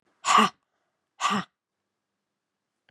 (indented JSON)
{
  "exhalation_length": "2.9 s",
  "exhalation_amplitude": 16420,
  "exhalation_signal_mean_std_ratio": 0.29,
  "survey_phase": "beta (2021-08-13 to 2022-03-07)",
  "age": "45-64",
  "gender": "Female",
  "wearing_mask": "No",
  "symptom_none": true,
  "smoker_status": "Ex-smoker",
  "respiratory_condition_asthma": false,
  "respiratory_condition_other": false,
  "recruitment_source": "Test and Trace",
  "submission_delay": "3 days",
  "covid_test_result": "Negative",
  "covid_test_method": "RT-qPCR"
}